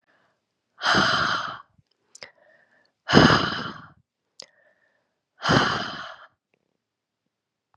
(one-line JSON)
{"exhalation_length": "7.8 s", "exhalation_amplitude": 31350, "exhalation_signal_mean_std_ratio": 0.35, "survey_phase": "beta (2021-08-13 to 2022-03-07)", "age": "18-44", "gender": "Female", "wearing_mask": "No", "symptom_cough_any": true, "symptom_new_continuous_cough": true, "symptom_runny_or_blocked_nose": true, "symptom_change_to_sense_of_smell_or_taste": true, "symptom_loss_of_taste": true, "symptom_other": true, "symptom_onset": "2 days", "smoker_status": "Never smoked", "respiratory_condition_asthma": false, "respiratory_condition_other": false, "recruitment_source": "Test and Trace", "submission_delay": "2 days", "covid_test_result": "Positive", "covid_test_method": "RT-qPCR", "covid_ct_value": 16.2, "covid_ct_gene": "ORF1ab gene", "covid_ct_mean": 16.6, "covid_viral_load": "3600000 copies/ml", "covid_viral_load_category": "High viral load (>1M copies/ml)"}